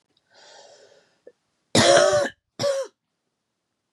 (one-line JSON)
{"cough_length": "3.9 s", "cough_amplitude": 21247, "cough_signal_mean_std_ratio": 0.37, "survey_phase": "beta (2021-08-13 to 2022-03-07)", "age": "45-64", "gender": "Female", "wearing_mask": "No", "symptom_cough_any": true, "symptom_runny_or_blocked_nose": true, "symptom_sore_throat": true, "symptom_fatigue": true, "symptom_fever_high_temperature": true, "symptom_headache": true, "symptom_change_to_sense_of_smell_or_taste": true, "symptom_loss_of_taste": true, "symptom_onset": "5 days", "smoker_status": "Never smoked", "respiratory_condition_asthma": false, "respiratory_condition_other": false, "recruitment_source": "Test and Trace", "submission_delay": "1 day", "covid_test_result": "Positive", "covid_test_method": "RT-qPCR"}